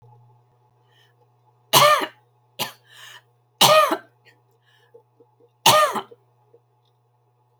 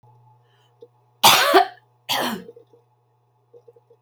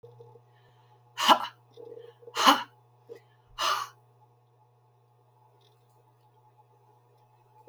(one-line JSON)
{"three_cough_length": "7.6 s", "three_cough_amplitude": 32768, "three_cough_signal_mean_std_ratio": 0.3, "cough_length": "4.0 s", "cough_amplitude": 32767, "cough_signal_mean_std_ratio": 0.31, "exhalation_length": "7.7 s", "exhalation_amplitude": 18935, "exhalation_signal_mean_std_ratio": 0.25, "survey_phase": "alpha (2021-03-01 to 2021-08-12)", "age": "65+", "gender": "Female", "wearing_mask": "No", "symptom_none": true, "smoker_status": "Never smoked", "respiratory_condition_asthma": false, "respiratory_condition_other": false, "recruitment_source": "REACT", "submission_delay": "8 days", "covid_test_result": "Negative", "covid_test_method": "RT-qPCR"}